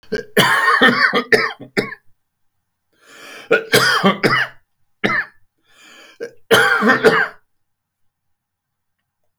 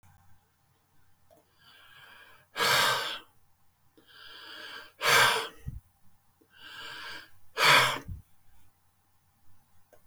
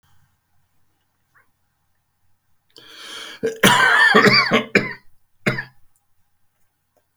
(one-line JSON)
{"three_cough_length": "9.4 s", "three_cough_amplitude": 32768, "three_cough_signal_mean_std_ratio": 0.47, "exhalation_length": "10.1 s", "exhalation_amplitude": 14014, "exhalation_signal_mean_std_ratio": 0.35, "cough_length": "7.2 s", "cough_amplitude": 32768, "cough_signal_mean_std_ratio": 0.36, "survey_phase": "beta (2021-08-13 to 2022-03-07)", "age": "65+", "gender": "Male", "wearing_mask": "No", "symptom_none": true, "smoker_status": "Never smoked", "respiratory_condition_asthma": false, "respiratory_condition_other": false, "recruitment_source": "REACT", "submission_delay": "2 days", "covid_test_result": "Negative", "covid_test_method": "RT-qPCR", "influenza_a_test_result": "Negative", "influenza_b_test_result": "Negative"}